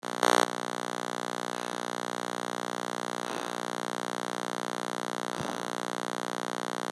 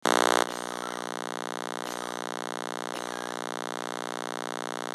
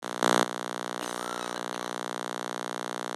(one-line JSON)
{"exhalation_length": "6.9 s", "exhalation_amplitude": 14523, "exhalation_signal_mean_std_ratio": 0.39, "three_cough_length": "4.9 s", "three_cough_amplitude": 15181, "three_cough_signal_mean_std_ratio": 0.36, "cough_length": "3.2 s", "cough_amplitude": 15041, "cough_signal_mean_std_ratio": 0.37, "survey_phase": "beta (2021-08-13 to 2022-03-07)", "age": "65+", "gender": "Female", "wearing_mask": "No", "symptom_none": true, "smoker_status": "Never smoked", "respiratory_condition_asthma": false, "respiratory_condition_other": false, "recruitment_source": "REACT", "submission_delay": "2 days", "covid_test_result": "Negative", "covid_test_method": "RT-qPCR"}